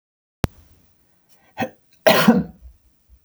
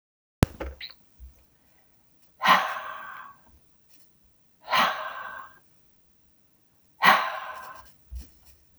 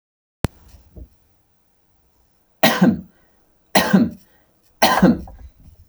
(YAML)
cough_length: 3.2 s
cough_amplitude: 32768
cough_signal_mean_std_ratio: 0.29
exhalation_length: 8.8 s
exhalation_amplitude: 25026
exhalation_signal_mean_std_ratio: 0.32
three_cough_length: 5.9 s
three_cough_amplitude: 32768
three_cough_signal_mean_std_ratio: 0.34
survey_phase: beta (2021-08-13 to 2022-03-07)
age: 45-64
gender: Male
wearing_mask: 'No'
symptom_none: true
smoker_status: Never smoked
respiratory_condition_asthma: false
respiratory_condition_other: false
recruitment_source: Test and Trace
submission_delay: 2 days
covid_test_result: Negative
covid_test_method: ePCR